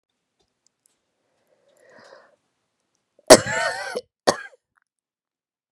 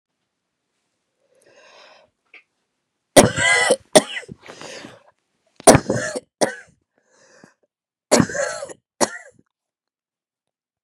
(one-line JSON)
{"cough_length": "5.7 s", "cough_amplitude": 32768, "cough_signal_mean_std_ratio": 0.17, "three_cough_length": "10.8 s", "three_cough_amplitude": 32768, "three_cough_signal_mean_std_ratio": 0.26, "survey_phase": "beta (2021-08-13 to 2022-03-07)", "age": "18-44", "gender": "Female", "wearing_mask": "No", "symptom_cough_any": true, "symptom_runny_or_blocked_nose": true, "symptom_shortness_of_breath": true, "symptom_sore_throat": true, "symptom_fatigue": true, "symptom_headache": true, "symptom_change_to_sense_of_smell_or_taste": true, "symptom_loss_of_taste": true, "symptom_onset": "5 days", "smoker_status": "Ex-smoker", "respiratory_condition_asthma": false, "respiratory_condition_other": false, "recruitment_source": "REACT", "submission_delay": "1 day", "covid_test_result": "Positive", "covid_test_method": "RT-qPCR", "covid_ct_value": 20.0, "covid_ct_gene": "E gene"}